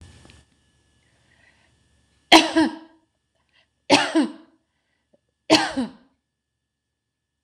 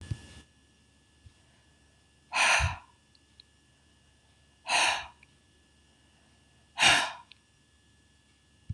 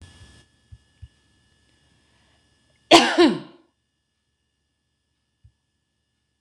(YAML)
three_cough_length: 7.4 s
three_cough_amplitude: 26028
three_cough_signal_mean_std_ratio: 0.26
exhalation_length: 8.7 s
exhalation_amplitude: 11744
exhalation_signal_mean_std_ratio: 0.3
cough_length: 6.4 s
cough_amplitude: 26028
cough_signal_mean_std_ratio: 0.2
survey_phase: beta (2021-08-13 to 2022-03-07)
age: 45-64
gender: Female
wearing_mask: 'No'
symptom_runny_or_blocked_nose: true
smoker_status: Ex-smoker
respiratory_condition_asthma: false
respiratory_condition_other: false
recruitment_source: REACT
submission_delay: 1 day
covid_test_result: Negative
covid_test_method: RT-qPCR
influenza_a_test_result: Unknown/Void
influenza_b_test_result: Unknown/Void